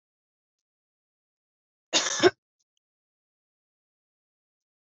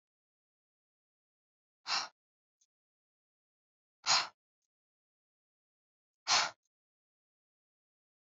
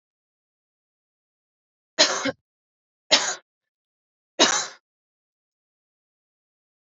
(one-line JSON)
{"cough_length": "4.9 s", "cough_amplitude": 16387, "cough_signal_mean_std_ratio": 0.17, "exhalation_length": "8.4 s", "exhalation_amplitude": 5241, "exhalation_signal_mean_std_ratio": 0.2, "three_cough_length": "6.9 s", "three_cough_amplitude": 26354, "three_cough_signal_mean_std_ratio": 0.23, "survey_phase": "beta (2021-08-13 to 2022-03-07)", "age": "18-44", "gender": "Female", "wearing_mask": "No", "symptom_runny_or_blocked_nose": true, "symptom_fatigue": true, "symptom_headache": true, "symptom_change_to_sense_of_smell_or_taste": true, "symptom_loss_of_taste": true, "symptom_onset": "7 days", "smoker_status": "Never smoked", "respiratory_condition_asthma": false, "respiratory_condition_other": false, "recruitment_source": "Test and Trace", "submission_delay": "2 days", "covid_test_result": "Positive", "covid_test_method": "ePCR"}